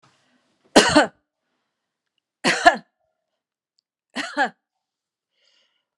{"three_cough_length": "6.0 s", "three_cough_amplitude": 32767, "three_cough_signal_mean_std_ratio": 0.24, "survey_phase": "alpha (2021-03-01 to 2021-08-12)", "age": "65+", "gender": "Female", "wearing_mask": "No", "symptom_shortness_of_breath": true, "symptom_fatigue": true, "symptom_onset": "12 days", "smoker_status": "Never smoked", "respiratory_condition_asthma": false, "respiratory_condition_other": false, "recruitment_source": "REACT", "submission_delay": "1 day", "covid_test_result": "Negative", "covid_test_method": "RT-qPCR"}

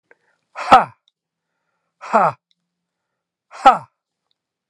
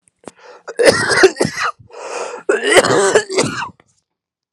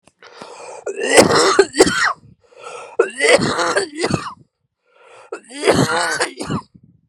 {"exhalation_length": "4.7 s", "exhalation_amplitude": 32768, "exhalation_signal_mean_std_ratio": 0.23, "cough_length": "4.5 s", "cough_amplitude": 32768, "cough_signal_mean_std_ratio": 0.53, "three_cough_length": "7.1 s", "three_cough_amplitude": 32768, "three_cough_signal_mean_std_ratio": 0.52, "survey_phase": "alpha (2021-03-01 to 2021-08-12)", "age": "45-64", "gender": "Male", "wearing_mask": "No", "symptom_shortness_of_breath": true, "symptom_abdominal_pain": true, "symptom_fatigue": true, "symptom_fever_high_temperature": true, "symptom_headache": true, "symptom_change_to_sense_of_smell_or_taste": true, "symptom_loss_of_taste": true, "symptom_onset": "6 days", "smoker_status": "Ex-smoker", "respiratory_condition_asthma": false, "respiratory_condition_other": true, "recruitment_source": "Test and Trace", "submission_delay": "2 days", "covid_test_result": "Positive", "covid_test_method": "RT-qPCR", "covid_ct_value": 22.0, "covid_ct_gene": "ORF1ab gene"}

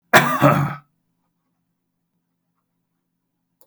{"cough_length": "3.7 s", "cough_amplitude": 32767, "cough_signal_mean_std_ratio": 0.29, "survey_phase": "beta (2021-08-13 to 2022-03-07)", "age": "65+", "gender": "Male", "wearing_mask": "No", "symptom_none": true, "smoker_status": "Ex-smoker", "respiratory_condition_asthma": false, "respiratory_condition_other": false, "recruitment_source": "REACT", "submission_delay": "3 days", "covid_test_result": "Negative", "covid_test_method": "RT-qPCR"}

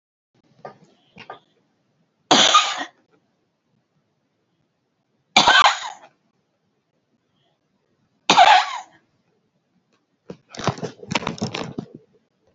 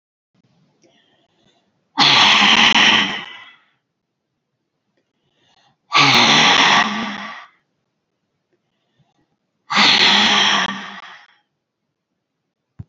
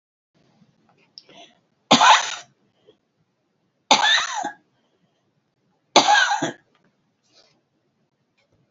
{"cough_length": "12.5 s", "cough_amplitude": 32768, "cough_signal_mean_std_ratio": 0.28, "exhalation_length": "12.9 s", "exhalation_amplitude": 31580, "exhalation_signal_mean_std_ratio": 0.44, "three_cough_length": "8.7 s", "three_cough_amplitude": 32768, "three_cough_signal_mean_std_ratio": 0.3, "survey_phase": "beta (2021-08-13 to 2022-03-07)", "age": "65+", "gender": "Female", "wearing_mask": "No", "symptom_runny_or_blocked_nose": true, "symptom_shortness_of_breath": true, "symptom_sore_throat": true, "symptom_fatigue": true, "smoker_status": "Never smoked", "respiratory_condition_asthma": false, "respiratory_condition_other": true, "recruitment_source": "REACT", "submission_delay": "0 days", "covid_test_result": "Negative", "covid_test_method": "RT-qPCR", "influenza_a_test_result": "Negative", "influenza_b_test_result": "Negative"}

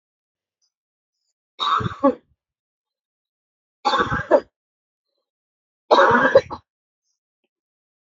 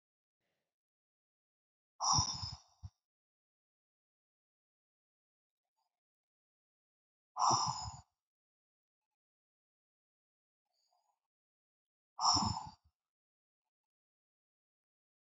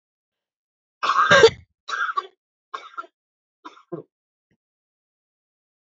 {"three_cough_length": "8.0 s", "three_cough_amplitude": 29243, "three_cough_signal_mean_std_ratio": 0.3, "exhalation_length": "15.3 s", "exhalation_amplitude": 4060, "exhalation_signal_mean_std_ratio": 0.23, "cough_length": "5.8 s", "cough_amplitude": 28052, "cough_signal_mean_std_ratio": 0.26, "survey_phase": "beta (2021-08-13 to 2022-03-07)", "age": "45-64", "gender": "Female", "wearing_mask": "No", "symptom_cough_any": true, "symptom_runny_or_blocked_nose": true, "symptom_change_to_sense_of_smell_or_taste": true, "symptom_loss_of_taste": true, "symptom_onset": "2 days", "smoker_status": "Ex-smoker", "respiratory_condition_asthma": false, "respiratory_condition_other": false, "recruitment_source": "Test and Trace", "submission_delay": "1 day", "covid_test_result": "Positive", "covid_test_method": "ePCR"}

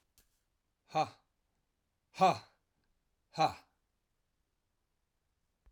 {"exhalation_length": "5.7 s", "exhalation_amplitude": 5421, "exhalation_signal_mean_std_ratio": 0.21, "survey_phase": "alpha (2021-03-01 to 2021-08-12)", "age": "45-64", "gender": "Male", "wearing_mask": "No", "symptom_cough_any": true, "smoker_status": "Never smoked", "respiratory_condition_asthma": false, "respiratory_condition_other": false, "recruitment_source": "Test and Trace", "submission_delay": "1 day", "covid_test_result": "Positive", "covid_test_method": "RT-qPCR", "covid_ct_value": 12.4, "covid_ct_gene": "ORF1ab gene", "covid_ct_mean": 13.5, "covid_viral_load": "37000000 copies/ml", "covid_viral_load_category": "High viral load (>1M copies/ml)"}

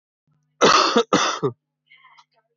{"cough_length": "2.6 s", "cough_amplitude": 21713, "cough_signal_mean_std_ratio": 0.43, "survey_phase": "alpha (2021-03-01 to 2021-08-12)", "age": "18-44", "gender": "Male", "wearing_mask": "No", "symptom_none": true, "smoker_status": "Current smoker (1 to 10 cigarettes per day)", "respiratory_condition_asthma": true, "respiratory_condition_other": false, "recruitment_source": "REACT", "submission_delay": "2 days", "covid_test_result": "Negative", "covid_test_method": "RT-qPCR"}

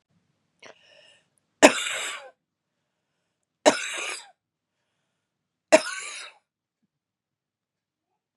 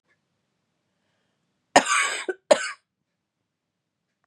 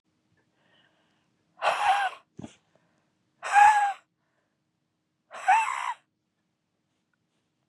{"three_cough_length": "8.4 s", "three_cough_amplitude": 32768, "three_cough_signal_mean_std_ratio": 0.2, "cough_length": "4.3 s", "cough_amplitude": 30689, "cough_signal_mean_std_ratio": 0.24, "exhalation_length": "7.7 s", "exhalation_amplitude": 14264, "exhalation_signal_mean_std_ratio": 0.32, "survey_phase": "beta (2021-08-13 to 2022-03-07)", "age": "18-44", "gender": "Female", "wearing_mask": "No", "symptom_cough_any": true, "symptom_new_continuous_cough": true, "symptom_runny_or_blocked_nose": true, "symptom_shortness_of_breath": true, "symptom_sore_throat": true, "symptom_fatigue": true, "symptom_headache": true, "symptom_onset": "2 days", "smoker_status": "Never smoked", "respiratory_condition_asthma": false, "respiratory_condition_other": false, "recruitment_source": "Test and Trace", "submission_delay": "2 days", "covid_test_result": "Positive", "covid_test_method": "RT-qPCR", "covid_ct_value": 26.2, "covid_ct_gene": "ORF1ab gene", "covid_ct_mean": 26.5, "covid_viral_load": "2100 copies/ml", "covid_viral_load_category": "Minimal viral load (< 10K copies/ml)"}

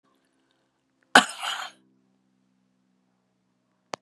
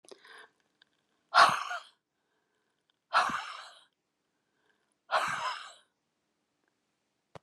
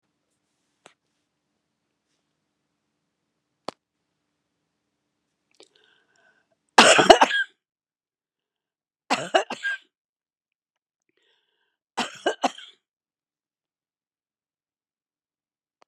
{"cough_length": "4.0 s", "cough_amplitude": 32768, "cough_signal_mean_std_ratio": 0.15, "exhalation_length": "7.4 s", "exhalation_amplitude": 12580, "exhalation_signal_mean_std_ratio": 0.27, "three_cough_length": "15.9 s", "three_cough_amplitude": 32768, "three_cough_signal_mean_std_ratio": 0.17, "survey_phase": "beta (2021-08-13 to 2022-03-07)", "age": "65+", "gender": "Female", "wearing_mask": "No", "symptom_none": true, "smoker_status": "Never smoked", "respiratory_condition_asthma": false, "respiratory_condition_other": false, "recruitment_source": "REACT", "submission_delay": "1 day", "covid_test_result": "Negative", "covid_test_method": "RT-qPCR"}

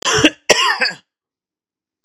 {"cough_length": "2.0 s", "cough_amplitude": 32768, "cough_signal_mean_std_ratio": 0.44, "survey_phase": "beta (2021-08-13 to 2022-03-07)", "age": "45-64", "gender": "Male", "wearing_mask": "No", "symptom_runny_or_blocked_nose": true, "symptom_sore_throat": true, "symptom_fatigue": true, "symptom_fever_high_temperature": true, "symptom_headache": true, "symptom_change_to_sense_of_smell_or_taste": true, "symptom_onset": "4 days", "smoker_status": "Never smoked", "respiratory_condition_asthma": false, "respiratory_condition_other": false, "recruitment_source": "Test and Trace", "submission_delay": "2 days", "covid_test_result": "Positive", "covid_test_method": "ePCR"}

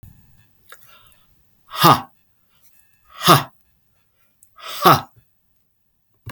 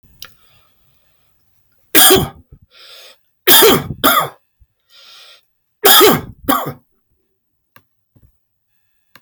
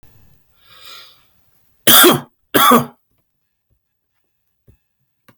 {"exhalation_length": "6.3 s", "exhalation_amplitude": 32768, "exhalation_signal_mean_std_ratio": 0.25, "three_cough_length": "9.2 s", "three_cough_amplitude": 32768, "three_cough_signal_mean_std_ratio": 0.34, "cough_length": "5.4 s", "cough_amplitude": 32768, "cough_signal_mean_std_ratio": 0.29, "survey_phase": "beta (2021-08-13 to 2022-03-07)", "age": "45-64", "gender": "Male", "wearing_mask": "No", "symptom_none": true, "smoker_status": "Never smoked", "respiratory_condition_asthma": false, "respiratory_condition_other": false, "recruitment_source": "REACT", "submission_delay": "2 days", "covid_test_result": "Negative", "covid_test_method": "RT-qPCR"}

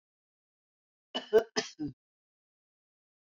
{"cough_length": "3.2 s", "cough_amplitude": 7039, "cough_signal_mean_std_ratio": 0.21, "survey_phase": "beta (2021-08-13 to 2022-03-07)", "age": "65+", "gender": "Female", "wearing_mask": "No", "symptom_none": true, "smoker_status": "Current smoker (1 to 10 cigarettes per day)", "respiratory_condition_asthma": false, "respiratory_condition_other": false, "recruitment_source": "REACT", "submission_delay": "1 day", "covid_test_result": "Negative", "covid_test_method": "RT-qPCR", "influenza_a_test_result": "Negative", "influenza_b_test_result": "Negative"}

